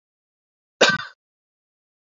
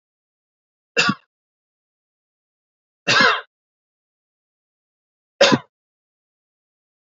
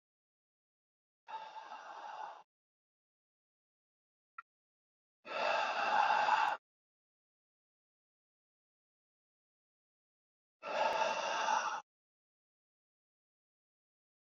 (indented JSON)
{
  "cough_length": "2.0 s",
  "cough_amplitude": 29598,
  "cough_signal_mean_std_ratio": 0.22,
  "three_cough_length": "7.2 s",
  "three_cough_amplitude": 30784,
  "three_cough_signal_mean_std_ratio": 0.23,
  "exhalation_length": "14.3 s",
  "exhalation_amplitude": 4382,
  "exhalation_signal_mean_std_ratio": 0.35,
  "survey_phase": "beta (2021-08-13 to 2022-03-07)",
  "age": "45-64",
  "gender": "Male",
  "wearing_mask": "No",
  "symptom_none": true,
  "smoker_status": "Ex-smoker",
  "respiratory_condition_asthma": false,
  "respiratory_condition_other": false,
  "recruitment_source": "REACT",
  "submission_delay": "3 days",
  "covid_test_result": "Negative",
  "covid_test_method": "RT-qPCR"
}